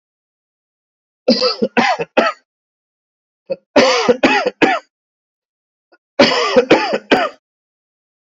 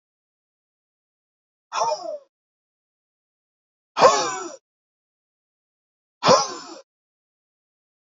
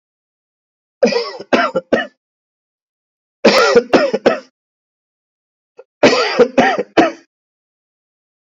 {"cough_length": "8.4 s", "cough_amplitude": 30929, "cough_signal_mean_std_ratio": 0.43, "exhalation_length": "8.2 s", "exhalation_amplitude": 27774, "exhalation_signal_mean_std_ratio": 0.25, "three_cough_length": "8.4 s", "three_cough_amplitude": 32767, "three_cough_signal_mean_std_ratio": 0.4, "survey_phase": "alpha (2021-03-01 to 2021-08-12)", "age": "18-44", "gender": "Male", "wearing_mask": "No", "symptom_none": true, "smoker_status": "Never smoked", "respiratory_condition_asthma": false, "respiratory_condition_other": false, "recruitment_source": "REACT", "submission_delay": "1 day", "covid_test_result": "Negative", "covid_test_method": "RT-qPCR"}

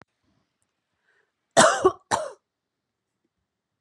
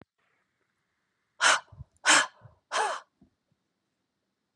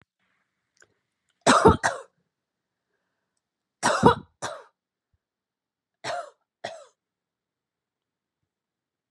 {"cough_length": "3.8 s", "cough_amplitude": 27770, "cough_signal_mean_std_ratio": 0.25, "exhalation_length": "4.6 s", "exhalation_amplitude": 12911, "exhalation_signal_mean_std_ratio": 0.28, "three_cough_length": "9.1 s", "three_cough_amplitude": 25137, "three_cough_signal_mean_std_ratio": 0.23, "survey_phase": "beta (2021-08-13 to 2022-03-07)", "age": "18-44", "gender": "Female", "wearing_mask": "No", "symptom_fatigue": true, "smoker_status": "Never smoked", "respiratory_condition_asthma": false, "respiratory_condition_other": false, "recruitment_source": "REACT", "submission_delay": "1 day", "covid_test_result": "Negative", "covid_test_method": "RT-qPCR", "influenza_a_test_result": "Negative", "influenza_b_test_result": "Negative"}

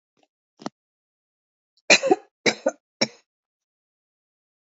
{"three_cough_length": "4.7 s", "three_cough_amplitude": 29432, "three_cough_signal_mean_std_ratio": 0.21, "survey_phase": "alpha (2021-03-01 to 2021-08-12)", "age": "45-64", "gender": "Female", "wearing_mask": "No", "symptom_none": true, "smoker_status": "Never smoked", "respiratory_condition_asthma": false, "respiratory_condition_other": false, "recruitment_source": "REACT", "submission_delay": "1 day", "covid_test_result": "Negative", "covid_test_method": "RT-qPCR"}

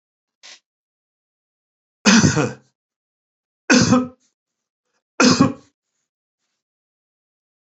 {"three_cough_length": "7.7 s", "three_cough_amplitude": 32768, "three_cough_signal_mean_std_ratio": 0.3, "survey_phase": "beta (2021-08-13 to 2022-03-07)", "age": "65+", "gender": "Male", "wearing_mask": "No", "symptom_none": true, "smoker_status": "Never smoked", "respiratory_condition_asthma": false, "respiratory_condition_other": false, "recruitment_source": "REACT", "submission_delay": "2 days", "covid_test_result": "Negative", "covid_test_method": "RT-qPCR", "influenza_a_test_result": "Negative", "influenza_b_test_result": "Negative"}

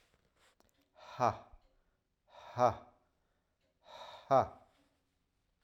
{"exhalation_length": "5.6 s", "exhalation_amplitude": 5707, "exhalation_signal_mean_std_ratio": 0.24, "survey_phase": "alpha (2021-03-01 to 2021-08-12)", "age": "45-64", "gender": "Male", "wearing_mask": "No", "symptom_none": true, "smoker_status": "Ex-smoker", "respiratory_condition_asthma": false, "respiratory_condition_other": false, "recruitment_source": "REACT", "submission_delay": "1 day", "covid_test_result": "Negative", "covid_test_method": "RT-qPCR"}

